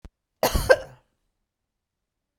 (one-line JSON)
{"cough_length": "2.4 s", "cough_amplitude": 26902, "cough_signal_mean_std_ratio": 0.25, "survey_phase": "beta (2021-08-13 to 2022-03-07)", "age": "45-64", "gender": "Female", "wearing_mask": "No", "symptom_none": true, "symptom_onset": "12 days", "smoker_status": "Never smoked", "respiratory_condition_asthma": false, "respiratory_condition_other": false, "recruitment_source": "REACT", "submission_delay": "2 days", "covid_test_result": "Negative", "covid_test_method": "RT-qPCR"}